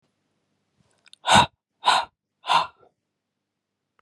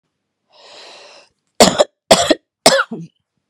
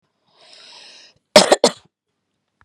{"exhalation_length": "4.0 s", "exhalation_amplitude": 26054, "exhalation_signal_mean_std_ratio": 0.28, "three_cough_length": "3.5 s", "three_cough_amplitude": 32768, "three_cough_signal_mean_std_ratio": 0.32, "cough_length": "2.6 s", "cough_amplitude": 32768, "cough_signal_mean_std_ratio": 0.23, "survey_phase": "beta (2021-08-13 to 2022-03-07)", "age": "18-44", "gender": "Female", "wearing_mask": "No", "symptom_cough_any": true, "symptom_shortness_of_breath": true, "symptom_fever_high_temperature": true, "symptom_onset": "8 days", "smoker_status": "Ex-smoker", "respiratory_condition_asthma": true, "respiratory_condition_other": false, "recruitment_source": "REACT", "submission_delay": "1 day", "covid_test_result": "Negative", "covid_test_method": "RT-qPCR"}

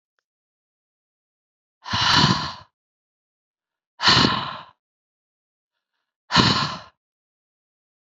{"exhalation_length": "8.0 s", "exhalation_amplitude": 28317, "exhalation_signal_mean_std_ratio": 0.33, "survey_phase": "beta (2021-08-13 to 2022-03-07)", "age": "45-64", "gender": "Female", "wearing_mask": "No", "symptom_cough_any": true, "symptom_new_continuous_cough": true, "symptom_runny_or_blocked_nose": true, "symptom_sore_throat": true, "symptom_abdominal_pain": true, "symptom_fatigue": true, "symptom_headache": true, "symptom_change_to_sense_of_smell_or_taste": true, "symptom_onset": "3 days", "smoker_status": "Ex-smoker", "respiratory_condition_asthma": true, "respiratory_condition_other": false, "recruitment_source": "Test and Trace", "submission_delay": "2 days", "covid_test_result": "Positive", "covid_test_method": "RT-qPCR", "covid_ct_value": 34.8, "covid_ct_gene": "ORF1ab gene"}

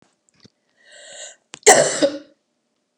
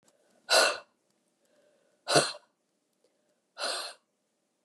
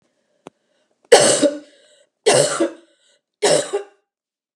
{"cough_length": "3.0 s", "cough_amplitude": 32768, "cough_signal_mean_std_ratio": 0.29, "exhalation_length": "4.6 s", "exhalation_amplitude": 11672, "exhalation_signal_mean_std_ratio": 0.29, "three_cough_length": "4.6 s", "three_cough_amplitude": 32768, "three_cough_signal_mean_std_ratio": 0.38, "survey_phase": "beta (2021-08-13 to 2022-03-07)", "age": "65+", "gender": "Female", "wearing_mask": "No", "symptom_none": true, "smoker_status": "Never smoked", "respiratory_condition_asthma": false, "respiratory_condition_other": false, "recruitment_source": "REACT", "submission_delay": "2 days", "covid_test_result": "Negative", "covid_test_method": "RT-qPCR", "influenza_a_test_result": "Negative", "influenza_b_test_result": "Negative"}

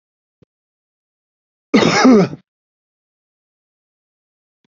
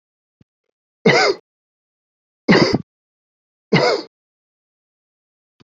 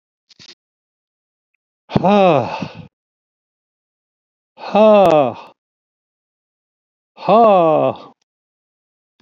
{"cough_length": "4.7 s", "cough_amplitude": 29174, "cough_signal_mean_std_ratio": 0.28, "three_cough_length": "5.6 s", "three_cough_amplitude": 30914, "three_cough_signal_mean_std_ratio": 0.31, "exhalation_length": "9.2 s", "exhalation_amplitude": 32768, "exhalation_signal_mean_std_ratio": 0.36, "survey_phase": "beta (2021-08-13 to 2022-03-07)", "age": "65+", "gender": "Male", "wearing_mask": "No", "symptom_cough_any": true, "symptom_runny_or_blocked_nose": true, "smoker_status": "Ex-smoker", "respiratory_condition_asthma": false, "respiratory_condition_other": false, "recruitment_source": "REACT", "submission_delay": "2 days", "covid_test_result": "Negative", "covid_test_method": "RT-qPCR", "covid_ct_value": 39.0, "covid_ct_gene": "N gene", "influenza_a_test_result": "Negative", "influenza_b_test_result": "Negative"}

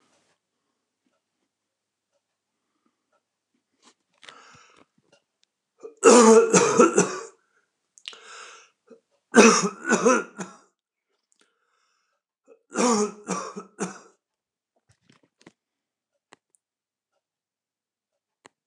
{"three_cough_length": "18.7 s", "three_cough_amplitude": 29204, "three_cough_signal_mean_std_ratio": 0.26, "survey_phase": "alpha (2021-03-01 to 2021-08-12)", "age": "65+", "gender": "Male", "wearing_mask": "No", "symptom_none": true, "smoker_status": "Current smoker (1 to 10 cigarettes per day)", "respiratory_condition_asthma": false, "respiratory_condition_other": false, "recruitment_source": "REACT", "submission_delay": "8 days", "covid_test_result": "Negative", "covid_test_method": "RT-qPCR"}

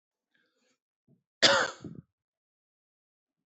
{"cough_length": "3.6 s", "cough_amplitude": 17136, "cough_signal_mean_std_ratio": 0.22, "survey_phase": "alpha (2021-03-01 to 2021-08-12)", "age": "45-64", "gender": "Male", "wearing_mask": "No", "symptom_none": true, "smoker_status": "Current smoker (1 to 10 cigarettes per day)", "respiratory_condition_asthma": true, "respiratory_condition_other": false, "recruitment_source": "REACT", "submission_delay": "1 day", "covid_test_result": "Negative", "covid_test_method": "RT-qPCR"}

